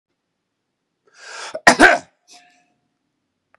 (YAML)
cough_length: 3.6 s
cough_amplitude: 32768
cough_signal_mean_std_ratio: 0.23
survey_phase: beta (2021-08-13 to 2022-03-07)
age: 65+
gender: Male
wearing_mask: 'No'
symptom_runny_or_blocked_nose: true
symptom_fatigue: true
symptom_headache: true
symptom_onset: 3 days
smoker_status: Never smoked
respiratory_condition_asthma: false
respiratory_condition_other: false
recruitment_source: Test and Trace
submission_delay: 2 days
covid_test_result: Positive
covid_test_method: RT-qPCR
covid_ct_value: 27.6
covid_ct_gene: N gene
covid_ct_mean: 27.7
covid_viral_load: 850 copies/ml
covid_viral_load_category: Minimal viral load (< 10K copies/ml)